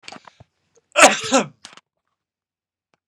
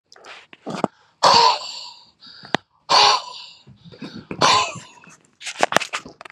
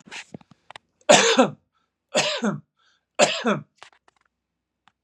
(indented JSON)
{
  "cough_length": "3.1 s",
  "cough_amplitude": 32768,
  "cough_signal_mean_std_ratio": 0.25,
  "exhalation_length": "6.3 s",
  "exhalation_amplitude": 32768,
  "exhalation_signal_mean_std_ratio": 0.39,
  "three_cough_length": "5.0 s",
  "three_cough_amplitude": 32721,
  "three_cough_signal_mean_std_ratio": 0.35,
  "survey_phase": "beta (2021-08-13 to 2022-03-07)",
  "age": "45-64",
  "gender": "Male",
  "wearing_mask": "No",
  "symptom_none": true,
  "smoker_status": "Never smoked",
  "respiratory_condition_asthma": false,
  "respiratory_condition_other": false,
  "recruitment_source": "REACT",
  "submission_delay": "1 day",
  "covid_test_result": "Negative",
  "covid_test_method": "RT-qPCR",
  "influenza_a_test_result": "Negative",
  "influenza_b_test_result": "Negative"
}